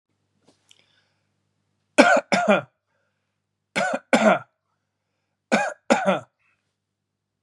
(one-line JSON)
{"three_cough_length": "7.4 s", "three_cough_amplitude": 32767, "three_cough_signal_mean_std_ratio": 0.32, "survey_phase": "beta (2021-08-13 to 2022-03-07)", "age": "45-64", "gender": "Male", "wearing_mask": "No", "symptom_none": true, "smoker_status": "Never smoked", "respiratory_condition_asthma": false, "respiratory_condition_other": false, "recruitment_source": "REACT", "submission_delay": "1 day", "covid_test_result": "Negative", "covid_test_method": "RT-qPCR", "influenza_a_test_result": "Negative", "influenza_b_test_result": "Negative"}